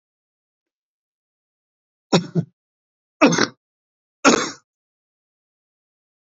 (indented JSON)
{
  "three_cough_length": "6.4 s",
  "three_cough_amplitude": 28881,
  "three_cough_signal_mean_std_ratio": 0.23,
  "survey_phase": "beta (2021-08-13 to 2022-03-07)",
  "age": "65+",
  "gender": "Male",
  "wearing_mask": "No",
  "symptom_fatigue": true,
  "symptom_fever_high_temperature": true,
  "symptom_onset": "3 days",
  "smoker_status": "Never smoked",
  "respiratory_condition_asthma": true,
  "respiratory_condition_other": true,
  "recruitment_source": "Test and Trace",
  "submission_delay": "2 days",
  "covid_test_result": "Positive",
  "covid_test_method": "RT-qPCR",
  "covid_ct_value": 14.7,
  "covid_ct_gene": "ORF1ab gene",
  "covid_ct_mean": 15.3,
  "covid_viral_load": "9900000 copies/ml",
  "covid_viral_load_category": "High viral load (>1M copies/ml)"
}